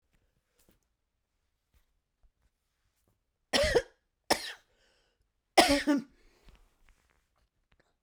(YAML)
three_cough_length: 8.0 s
three_cough_amplitude: 19755
three_cough_signal_mean_std_ratio: 0.24
survey_phase: beta (2021-08-13 to 2022-03-07)
age: 45-64
gender: Female
wearing_mask: 'No'
symptom_cough_any: true
symptom_runny_or_blocked_nose: true
symptom_shortness_of_breath: true
symptom_headache: true
symptom_change_to_sense_of_smell_or_taste: true
symptom_loss_of_taste: true
symptom_onset: 2 days
smoker_status: Never smoked
respiratory_condition_asthma: false
respiratory_condition_other: false
recruitment_source: Test and Trace
submission_delay: 1 day
covid_test_result: Positive
covid_test_method: RT-qPCR